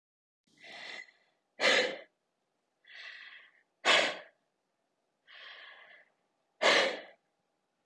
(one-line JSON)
{"exhalation_length": "7.9 s", "exhalation_amplitude": 8220, "exhalation_signal_mean_std_ratio": 0.31, "survey_phase": "beta (2021-08-13 to 2022-03-07)", "age": "18-44", "gender": "Female", "wearing_mask": "Yes", "symptom_none": true, "smoker_status": "Never smoked", "respiratory_condition_asthma": true, "respiratory_condition_other": false, "recruitment_source": "REACT", "submission_delay": "1 day", "covid_test_result": "Negative", "covid_test_method": "RT-qPCR", "influenza_a_test_result": "Negative", "influenza_b_test_result": "Negative"}